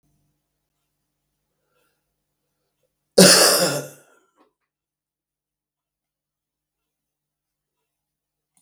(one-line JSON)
{"cough_length": "8.6 s", "cough_amplitude": 32768, "cough_signal_mean_std_ratio": 0.2, "survey_phase": "beta (2021-08-13 to 2022-03-07)", "age": "65+", "gender": "Male", "wearing_mask": "No", "symptom_cough_any": true, "symptom_runny_or_blocked_nose": true, "symptom_sore_throat": true, "smoker_status": "Ex-smoker", "respiratory_condition_asthma": false, "respiratory_condition_other": false, "recruitment_source": "Test and Trace", "submission_delay": "2 days", "covid_test_result": "Positive", "covid_test_method": "RT-qPCR"}